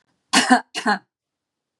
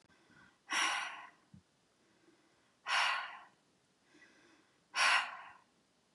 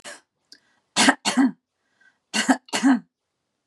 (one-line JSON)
{"cough_length": "1.8 s", "cough_amplitude": 31086, "cough_signal_mean_std_ratio": 0.36, "exhalation_length": "6.1 s", "exhalation_amplitude": 4683, "exhalation_signal_mean_std_ratio": 0.37, "three_cough_length": "3.7 s", "three_cough_amplitude": 27223, "three_cough_signal_mean_std_ratio": 0.38, "survey_phase": "beta (2021-08-13 to 2022-03-07)", "age": "45-64", "gender": "Female", "wearing_mask": "No", "symptom_none": true, "symptom_onset": "7 days", "smoker_status": "Ex-smoker", "respiratory_condition_asthma": false, "respiratory_condition_other": false, "recruitment_source": "REACT", "submission_delay": "2 days", "covid_test_result": "Negative", "covid_test_method": "RT-qPCR", "influenza_a_test_result": "Unknown/Void", "influenza_b_test_result": "Unknown/Void"}